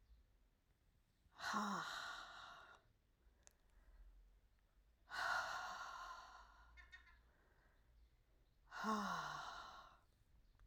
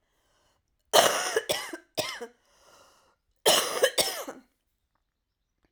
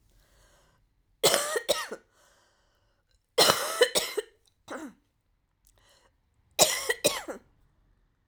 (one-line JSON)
{"exhalation_length": "10.7 s", "exhalation_amplitude": 977, "exhalation_signal_mean_std_ratio": 0.5, "cough_length": "5.7 s", "cough_amplitude": 25371, "cough_signal_mean_std_ratio": 0.36, "three_cough_length": "8.3 s", "three_cough_amplitude": 24835, "three_cough_signal_mean_std_ratio": 0.33, "survey_phase": "alpha (2021-03-01 to 2021-08-12)", "age": "45-64", "gender": "Female", "wearing_mask": "No", "symptom_none": true, "symptom_onset": "12 days", "smoker_status": "Ex-smoker", "respiratory_condition_asthma": true, "respiratory_condition_other": false, "recruitment_source": "REACT", "submission_delay": "3 days", "covid_test_result": "Negative", "covid_test_method": "RT-qPCR"}